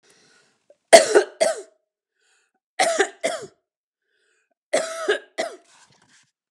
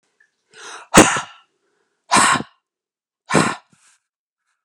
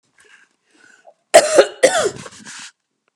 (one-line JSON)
{"three_cough_length": "6.5 s", "three_cough_amplitude": 32768, "three_cough_signal_mean_std_ratio": 0.29, "exhalation_length": "4.6 s", "exhalation_amplitude": 32768, "exhalation_signal_mean_std_ratio": 0.31, "cough_length": "3.2 s", "cough_amplitude": 32768, "cough_signal_mean_std_ratio": 0.32, "survey_phase": "beta (2021-08-13 to 2022-03-07)", "age": "45-64", "gender": "Female", "wearing_mask": "No", "symptom_none": true, "smoker_status": "Never smoked", "respiratory_condition_asthma": false, "respiratory_condition_other": false, "recruitment_source": "REACT", "submission_delay": "1 day", "covid_test_result": "Negative", "covid_test_method": "RT-qPCR"}